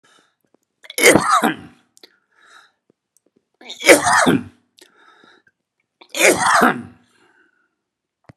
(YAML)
three_cough_length: 8.4 s
three_cough_amplitude: 32768
three_cough_signal_mean_std_ratio: 0.35
survey_phase: beta (2021-08-13 to 2022-03-07)
age: 65+
gender: Male
wearing_mask: 'No'
symptom_none: true
smoker_status: Ex-smoker
respiratory_condition_asthma: false
respiratory_condition_other: false
recruitment_source: REACT
submission_delay: 1 day
covid_test_result: Negative
covid_test_method: RT-qPCR